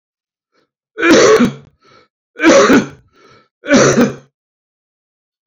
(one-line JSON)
{"three_cough_length": "5.5 s", "three_cough_amplitude": 31661, "three_cough_signal_mean_std_ratio": 0.45, "survey_phase": "beta (2021-08-13 to 2022-03-07)", "age": "65+", "gender": "Male", "wearing_mask": "No", "symptom_cough_any": true, "symptom_shortness_of_breath": true, "symptom_sore_throat": true, "symptom_abdominal_pain": true, "symptom_fatigue": true, "symptom_fever_high_temperature": true, "symptom_headache": true, "symptom_loss_of_taste": true, "symptom_onset": "8 days", "smoker_status": "Never smoked", "respiratory_condition_asthma": false, "respiratory_condition_other": false, "recruitment_source": "Test and Trace", "submission_delay": "2 days", "covid_test_result": "Positive", "covid_test_method": "RT-qPCR", "covid_ct_value": 23.4, "covid_ct_gene": "ORF1ab gene", "covid_ct_mean": 24.0, "covid_viral_load": "14000 copies/ml", "covid_viral_load_category": "Low viral load (10K-1M copies/ml)"}